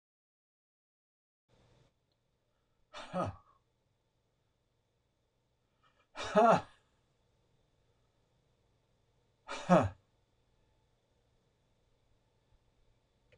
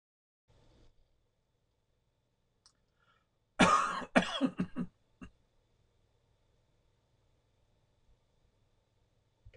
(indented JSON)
{
  "exhalation_length": "13.4 s",
  "exhalation_amplitude": 8311,
  "exhalation_signal_mean_std_ratio": 0.19,
  "cough_length": "9.6 s",
  "cough_amplitude": 11356,
  "cough_signal_mean_std_ratio": 0.23,
  "survey_phase": "beta (2021-08-13 to 2022-03-07)",
  "age": "65+",
  "gender": "Male",
  "wearing_mask": "No",
  "symptom_runny_or_blocked_nose": true,
  "smoker_status": "Never smoked",
  "respiratory_condition_asthma": false,
  "respiratory_condition_other": false,
  "recruitment_source": "REACT",
  "submission_delay": "1 day",
  "covid_test_result": "Negative",
  "covid_test_method": "RT-qPCR",
  "influenza_a_test_result": "Negative",
  "influenza_b_test_result": "Negative"
}